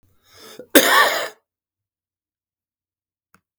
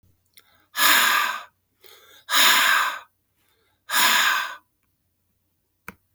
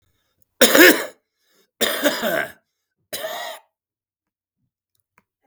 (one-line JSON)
{"cough_length": "3.6 s", "cough_amplitude": 32768, "cough_signal_mean_std_ratio": 0.28, "exhalation_length": "6.1 s", "exhalation_amplitude": 26274, "exhalation_signal_mean_std_ratio": 0.46, "three_cough_length": "5.5 s", "three_cough_amplitude": 32768, "three_cough_signal_mean_std_ratio": 0.31, "survey_phase": "beta (2021-08-13 to 2022-03-07)", "age": "65+", "gender": "Male", "wearing_mask": "No", "symptom_cough_any": true, "symptom_fatigue": true, "symptom_onset": "8 days", "smoker_status": "Never smoked", "respiratory_condition_asthma": false, "respiratory_condition_other": true, "recruitment_source": "Test and Trace", "submission_delay": "3 days", "covid_test_result": "Negative", "covid_test_method": "RT-qPCR"}